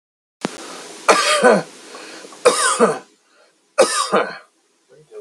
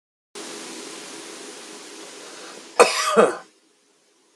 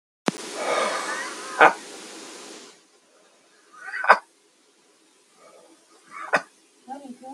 {"three_cough_length": "5.2 s", "three_cough_amplitude": 32768, "three_cough_signal_mean_std_ratio": 0.46, "cough_length": "4.4 s", "cough_amplitude": 32430, "cough_signal_mean_std_ratio": 0.34, "exhalation_length": "7.3 s", "exhalation_amplitude": 32768, "exhalation_signal_mean_std_ratio": 0.31, "survey_phase": "beta (2021-08-13 to 2022-03-07)", "age": "45-64", "gender": "Male", "wearing_mask": "No", "symptom_fatigue": true, "symptom_onset": "12 days", "smoker_status": "Ex-smoker", "respiratory_condition_asthma": false, "respiratory_condition_other": false, "recruitment_source": "REACT", "submission_delay": "6 days", "covid_test_result": "Negative", "covid_test_method": "RT-qPCR", "influenza_a_test_result": "Negative", "influenza_b_test_result": "Negative"}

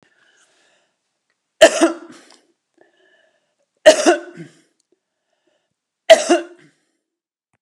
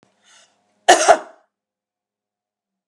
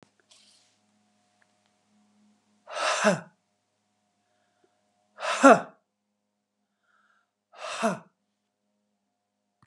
{"three_cough_length": "7.6 s", "three_cough_amplitude": 32768, "three_cough_signal_mean_std_ratio": 0.24, "cough_length": "2.9 s", "cough_amplitude": 32768, "cough_signal_mean_std_ratio": 0.23, "exhalation_length": "9.7 s", "exhalation_amplitude": 25662, "exhalation_signal_mean_std_ratio": 0.21, "survey_phase": "beta (2021-08-13 to 2022-03-07)", "age": "65+", "gender": "Female", "wearing_mask": "No", "symptom_none": true, "smoker_status": "Never smoked", "respiratory_condition_asthma": false, "respiratory_condition_other": false, "recruitment_source": "REACT", "submission_delay": "1 day", "covid_test_result": "Negative", "covid_test_method": "RT-qPCR"}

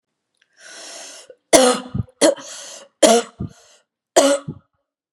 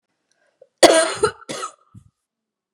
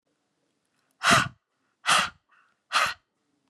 {"three_cough_length": "5.1 s", "three_cough_amplitude": 32768, "three_cough_signal_mean_std_ratio": 0.37, "cough_length": "2.7 s", "cough_amplitude": 32768, "cough_signal_mean_std_ratio": 0.3, "exhalation_length": "3.5 s", "exhalation_amplitude": 17502, "exhalation_signal_mean_std_ratio": 0.33, "survey_phase": "beta (2021-08-13 to 2022-03-07)", "age": "45-64", "gender": "Female", "wearing_mask": "No", "symptom_runny_or_blocked_nose": true, "symptom_diarrhoea": true, "symptom_fatigue": true, "symptom_headache": true, "smoker_status": "Ex-smoker", "respiratory_condition_asthma": false, "respiratory_condition_other": false, "recruitment_source": "Test and Trace", "submission_delay": "2 days", "covid_test_result": "Positive", "covid_test_method": "RT-qPCR", "covid_ct_value": 28.1, "covid_ct_gene": "N gene"}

